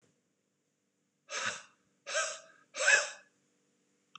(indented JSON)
{
  "exhalation_length": "4.2 s",
  "exhalation_amplitude": 10671,
  "exhalation_signal_mean_std_ratio": 0.32,
  "survey_phase": "beta (2021-08-13 to 2022-03-07)",
  "age": "45-64",
  "gender": "Male",
  "wearing_mask": "No",
  "symptom_none": true,
  "smoker_status": "Ex-smoker",
  "respiratory_condition_asthma": false,
  "respiratory_condition_other": false,
  "recruitment_source": "REACT",
  "submission_delay": "1 day",
  "covid_test_result": "Negative",
  "covid_test_method": "RT-qPCR"
}